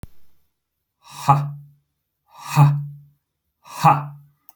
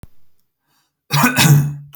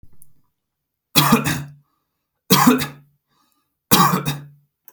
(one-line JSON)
{"exhalation_length": "4.6 s", "exhalation_amplitude": 28512, "exhalation_signal_mean_std_ratio": 0.35, "cough_length": "2.0 s", "cough_amplitude": 32767, "cough_signal_mean_std_ratio": 0.49, "three_cough_length": "4.9 s", "three_cough_amplitude": 32768, "three_cough_signal_mean_std_ratio": 0.39, "survey_phase": "alpha (2021-03-01 to 2021-08-12)", "age": "18-44", "gender": "Male", "wearing_mask": "No", "symptom_none": true, "smoker_status": "Never smoked", "respiratory_condition_asthma": false, "respiratory_condition_other": false, "recruitment_source": "REACT", "submission_delay": "1 day", "covid_test_result": "Negative", "covid_test_method": "RT-qPCR"}